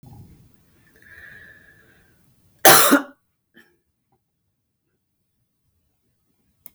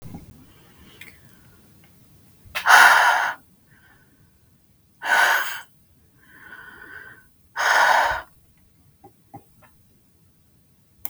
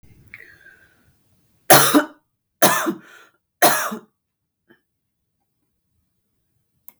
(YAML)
cough_length: 6.7 s
cough_amplitude: 32768
cough_signal_mean_std_ratio: 0.2
exhalation_length: 11.1 s
exhalation_amplitude: 32768
exhalation_signal_mean_std_ratio: 0.34
three_cough_length: 7.0 s
three_cough_amplitude: 32768
three_cough_signal_mean_std_ratio: 0.27
survey_phase: beta (2021-08-13 to 2022-03-07)
age: 45-64
gender: Female
wearing_mask: 'No'
symptom_none: true
smoker_status: Never smoked
respiratory_condition_asthma: false
respiratory_condition_other: false
recruitment_source: REACT
submission_delay: 2 days
covid_test_result: Negative
covid_test_method: RT-qPCR